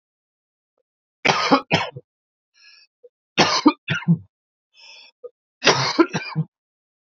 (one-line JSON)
{"three_cough_length": "7.2 s", "three_cough_amplitude": 32129, "three_cough_signal_mean_std_ratio": 0.35, "survey_phase": "beta (2021-08-13 to 2022-03-07)", "age": "18-44", "gender": "Male", "wearing_mask": "No", "symptom_none": true, "smoker_status": "Never smoked", "respiratory_condition_asthma": false, "respiratory_condition_other": false, "recruitment_source": "REACT", "submission_delay": "1 day", "covid_test_result": "Negative", "covid_test_method": "RT-qPCR", "influenza_a_test_result": "Negative", "influenza_b_test_result": "Negative"}